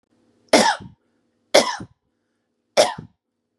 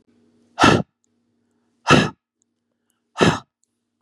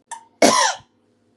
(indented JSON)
{
  "three_cough_length": "3.6 s",
  "three_cough_amplitude": 32767,
  "three_cough_signal_mean_std_ratio": 0.3,
  "exhalation_length": "4.0 s",
  "exhalation_amplitude": 32143,
  "exhalation_signal_mean_std_ratio": 0.3,
  "cough_length": "1.4 s",
  "cough_amplitude": 32767,
  "cough_signal_mean_std_ratio": 0.4,
  "survey_phase": "beta (2021-08-13 to 2022-03-07)",
  "age": "18-44",
  "gender": "Female",
  "wearing_mask": "No",
  "symptom_none": true,
  "smoker_status": "Current smoker (1 to 10 cigarettes per day)",
  "respiratory_condition_asthma": false,
  "respiratory_condition_other": false,
  "recruitment_source": "REACT",
  "submission_delay": "3 days",
  "covid_test_result": "Negative",
  "covid_test_method": "RT-qPCR",
  "influenza_a_test_result": "Negative",
  "influenza_b_test_result": "Negative"
}